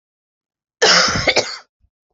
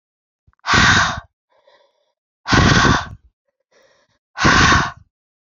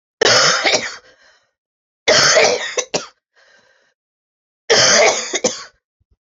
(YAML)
cough_length: 2.1 s
cough_amplitude: 32070
cough_signal_mean_std_ratio: 0.44
exhalation_length: 5.5 s
exhalation_amplitude: 30496
exhalation_signal_mean_std_ratio: 0.45
three_cough_length: 6.4 s
three_cough_amplitude: 32768
three_cough_signal_mean_std_ratio: 0.48
survey_phase: beta (2021-08-13 to 2022-03-07)
age: 45-64
gender: Female
wearing_mask: 'No'
symptom_cough_any: true
symptom_new_continuous_cough: true
symptom_runny_or_blocked_nose: true
symptom_fatigue: true
symptom_headache: true
symptom_other: true
smoker_status: Never smoked
respiratory_condition_asthma: false
respiratory_condition_other: false
recruitment_source: Test and Trace
submission_delay: 2 days
covid_test_result: Positive
covid_test_method: RT-qPCR